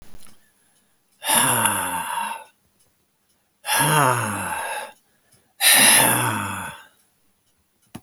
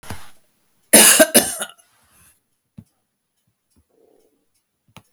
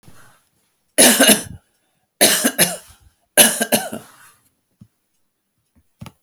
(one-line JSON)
{"exhalation_length": "8.0 s", "exhalation_amplitude": 30330, "exhalation_signal_mean_std_ratio": 0.5, "cough_length": "5.1 s", "cough_amplitude": 32768, "cough_signal_mean_std_ratio": 0.26, "three_cough_length": "6.2 s", "three_cough_amplitude": 32768, "three_cough_signal_mean_std_ratio": 0.34, "survey_phase": "beta (2021-08-13 to 2022-03-07)", "age": "65+", "gender": "Male", "wearing_mask": "No", "symptom_none": true, "smoker_status": "Never smoked", "respiratory_condition_asthma": true, "respiratory_condition_other": false, "recruitment_source": "REACT", "submission_delay": "1 day", "covid_test_result": "Negative", "covid_test_method": "RT-qPCR"}